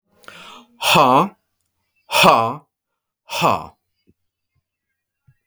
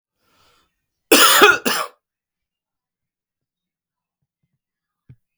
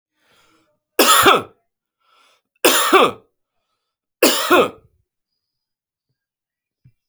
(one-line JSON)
{"exhalation_length": "5.5 s", "exhalation_amplitude": 32767, "exhalation_signal_mean_std_ratio": 0.36, "cough_length": "5.4 s", "cough_amplitude": 32768, "cough_signal_mean_std_ratio": 0.26, "three_cough_length": "7.1 s", "three_cough_amplitude": 32767, "three_cough_signal_mean_std_ratio": 0.34, "survey_phase": "beta (2021-08-13 to 2022-03-07)", "age": "45-64", "gender": "Male", "wearing_mask": "No", "symptom_none": true, "smoker_status": "Ex-smoker", "respiratory_condition_asthma": false, "respiratory_condition_other": false, "recruitment_source": "REACT", "submission_delay": "1 day", "covid_test_result": "Negative", "covid_test_method": "RT-qPCR"}